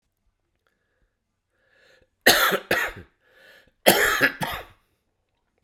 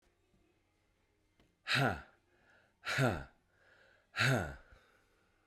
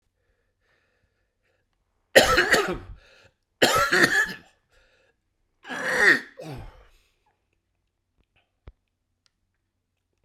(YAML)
cough_length: 5.6 s
cough_amplitude: 32767
cough_signal_mean_std_ratio: 0.33
exhalation_length: 5.5 s
exhalation_amplitude: 4341
exhalation_signal_mean_std_ratio: 0.36
three_cough_length: 10.2 s
three_cough_amplitude: 32768
three_cough_signal_mean_std_ratio: 0.32
survey_phase: beta (2021-08-13 to 2022-03-07)
age: 45-64
gender: Male
wearing_mask: 'No'
symptom_cough_any: true
symptom_runny_or_blocked_nose: true
symptom_change_to_sense_of_smell_or_taste: true
symptom_onset: 4 days
smoker_status: Never smoked
respiratory_condition_asthma: false
respiratory_condition_other: false
recruitment_source: Test and Trace
submission_delay: 2 days
covid_test_result: Positive
covid_test_method: RT-qPCR
covid_ct_value: 12.1
covid_ct_gene: ORF1ab gene
covid_ct_mean: 12.8
covid_viral_load: 62000000 copies/ml
covid_viral_load_category: High viral load (>1M copies/ml)